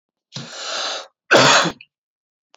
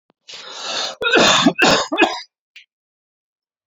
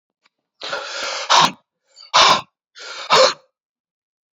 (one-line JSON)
{"cough_length": "2.6 s", "cough_amplitude": 29637, "cough_signal_mean_std_ratio": 0.41, "three_cough_length": "3.7 s", "three_cough_amplitude": 29114, "three_cough_signal_mean_std_ratio": 0.48, "exhalation_length": "4.4 s", "exhalation_amplitude": 30019, "exhalation_signal_mean_std_ratio": 0.39, "survey_phase": "alpha (2021-03-01 to 2021-08-12)", "age": "45-64", "gender": "Male", "wearing_mask": "No", "symptom_cough_any": true, "symptom_fatigue": true, "symptom_onset": "2 days", "smoker_status": "Never smoked", "respiratory_condition_asthma": false, "respiratory_condition_other": false, "recruitment_source": "Test and Trace", "submission_delay": "2 days", "covid_test_result": "Positive", "covid_test_method": "RT-qPCR", "covid_ct_value": 14.8, "covid_ct_gene": "ORF1ab gene", "covid_ct_mean": 14.9, "covid_viral_load": "13000000 copies/ml", "covid_viral_load_category": "High viral load (>1M copies/ml)"}